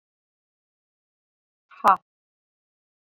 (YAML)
exhalation_length: 3.1 s
exhalation_amplitude: 23814
exhalation_signal_mean_std_ratio: 0.13
survey_phase: beta (2021-08-13 to 2022-03-07)
age: 18-44
gender: Female
wearing_mask: 'No'
symptom_none: true
smoker_status: Ex-smoker
respiratory_condition_asthma: false
respiratory_condition_other: false
recruitment_source: REACT
submission_delay: 1 day
covid_test_result: Negative
covid_test_method: RT-qPCR